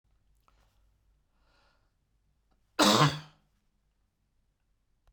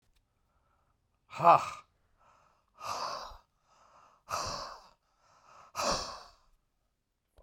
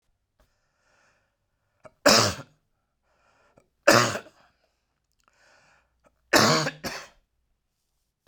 {"cough_length": "5.1 s", "cough_amplitude": 11899, "cough_signal_mean_std_ratio": 0.22, "exhalation_length": "7.4 s", "exhalation_amplitude": 12501, "exhalation_signal_mean_std_ratio": 0.27, "three_cough_length": "8.3 s", "three_cough_amplitude": 26513, "three_cough_signal_mean_std_ratio": 0.26, "survey_phase": "beta (2021-08-13 to 2022-03-07)", "age": "65+", "gender": "Male", "wearing_mask": "No", "symptom_cough_any": true, "symptom_new_continuous_cough": true, "symptom_runny_or_blocked_nose": true, "symptom_fatigue": true, "symptom_fever_high_temperature": true, "symptom_change_to_sense_of_smell_or_taste": true, "symptom_loss_of_taste": true, "symptom_onset": "9 days", "smoker_status": "Ex-smoker", "respiratory_condition_asthma": false, "respiratory_condition_other": false, "recruitment_source": "REACT", "submission_delay": "1 day", "covid_test_result": "Negative", "covid_test_method": "RT-qPCR"}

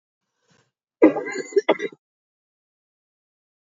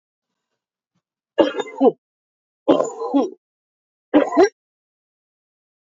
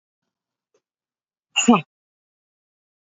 {"cough_length": "3.8 s", "cough_amplitude": 26670, "cough_signal_mean_std_ratio": 0.24, "three_cough_length": "6.0 s", "three_cough_amplitude": 27363, "three_cough_signal_mean_std_ratio": 0.32, "exhalation_length": "3.2 s", "exhalation_amplitude": 26313, "exhalation_signal_mean_std_ratio": 0.19, "survey_phase": "alpha (2021-03-01 to 2021-08-12)", "age": "65+", "gender": "Female", "wearing_mask": "No", "symptom_cough_any": true, "symptom_shortness_of_breath": true, "symptom_diarrhoea": true, "symptom_fatigue": true, "symptom_headache": true, "symptom_change_to_sense_of_smell_or_taste": true, "symptom_loss_of_taste": true, "symptom_onset": "6 days", "smoker_status": "Never smoked", "respiratory_condition_asthma": false, "respiratory_condition_other": false, "recruitment_source": "Test and Trace", "submission_delay": "1 day", "covid_test_result": "Positive", "covid_test_method": "RT-qPCR", "covid_ct_value": 13.4, "covid_ct_gene": "S gene", "covid_ct_mean": 13.8, "covid_viral_load": "30000000 copies/ml", "covid_viral_load_category": "High viral load (>1M copies/ml)"}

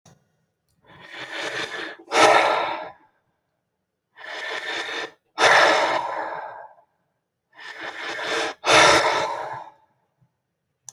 {"exhalation_length": "10.9 s", "exhalation_amplitude": 26323, "exhalation_signal_mean_std_ratio": 0.46, "survey_phase": "beta (2021-08-13 to 2022-03-07)", "age": "18-44", "gender": "Male", "wearing_mask": "No", "symptom_none": true, "smoker_status": "Never smoked", "respiratory_condition_asthma": false, "respiratory_condition_other": false, "recruitment_source": "REACT", "submission_delay": "1 day", "covid_test_result": "Negative", "covid_test_method": "RT-qPCR", "influenza_a_test_result": "Negative", "influenza_b_test_result": "Negative"}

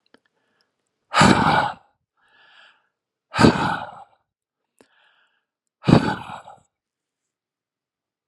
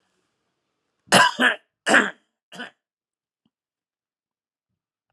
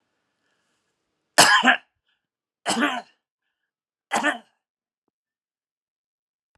{"exhalation_length": "8.3 s", "exhalation_amplitude": 32768, "exhalation_signal_mean_std_ratio": 0.29, "cough_length": "5.1 s", "cough_amplitude": 28542, "cough_signal_mean_std_ratio": 0.25, "three_cough_length": "6.6 s", "three_cough_amplitude": 32267, "three_cough_signal_mean_std_ratio": 0.26, "survey_phase": "alpha (2021-03-01 to 2021-08-12)", "age": "65+", "gender": "Male", "wearing_mask": "No", "symptom_none": true, "smoker_status": "Never smoked", "respiratory_condition_asthma": false, "respiratory_condition_other": false, "recruitment_source": "REACT", "submission_delay": "5 days", "covid_test_result": "Negative", "covid_test_method": "RT-qPCR"}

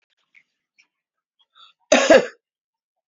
{"cough_length": "3.1 s", "cough_amplitude": 31271, "cough_signal_mean_std_ratio": 0.24, "survey_phase": "beta (2021-08-13 to 2022-03-07)", "age": "45-64", "gender": "Male", "wearing_mask": "No", "symptom_none": true, "smoker_status": "Never smoked", "respiratory_condition_asthma": true, "respiratory_condition_other": false, "recruitment_source": "REACT", "submission_delay": "1 day", "covid_test_result": "Negative", "covid_test_method": "RT-qPCR"}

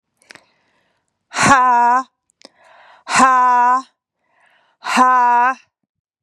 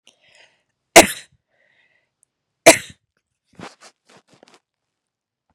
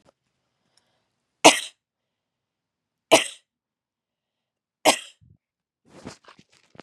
{"exhalation_length": "6.2 s", "exhalation_amplitude": 32767, "exhalation_signal_mean_std_ratio": 0.52, "cough_length": "5.5 s", "cough_amplitude": 32768, "cough_signal_mean_std_ratio": 0.15, "three_cough_length": "6.8 s", "three_cough_amplitude": 32768, "three_cough_signal_mean_std_ratio": 0.17, "survey_phase": "beta (2021-08-13 to 2022-03-07)", "age": "45-64", "gender": "Female", "wearing_mask": "No", "symptom_none": true, "smoker_status": "Ex-smoker", "respiratory_condition_asthma": false, "respiratory_condition_other": false, "recruitment_source": "Test and Trace", "submission_delay": "1 day", "covid_test_result": "Negative", "covid_test_method": "RT-qPCR"}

